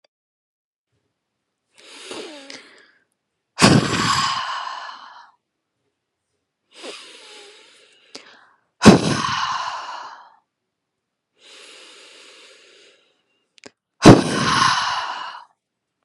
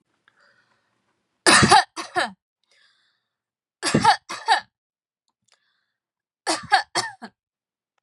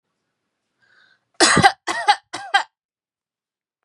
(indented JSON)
{
  "exhalation_length": "16.0 s",
  "exhalation_amplitude": 32768,
  "exhalation_signal_mean_std_ratio": 0.3,
  "three_cough_length": "8.0 s",
  "three_cough_amplitude": 30923,
  "three_cough_signal_mean_std_ratio": 0.3,
  "cough_length": "3.8 s",
  "cough_amplitude": 32767,
  "cough_signal_mean_std_ratio": 0.3,
  "survey_phase": "beta (2021-08-13 to 2022-03-07)",
  "age": "18-44",
  "gender": "Female",
  "wearing_mask": "Yes",
  "symptom_none": true,
  "smoker_status": "Never smoked",
  "respiratory_condition_asthma": false,
  "respiratory_condition_other": false,
  "recruitment_source": "REACT",
  "submission_delay": "2 days",
  "covid_test_result": "Negative",
  "covid_test_method": "RT-qPCR",
  "influenza_a_test_result": "Negative",
  "influenza_b_test_result": "Negative"
}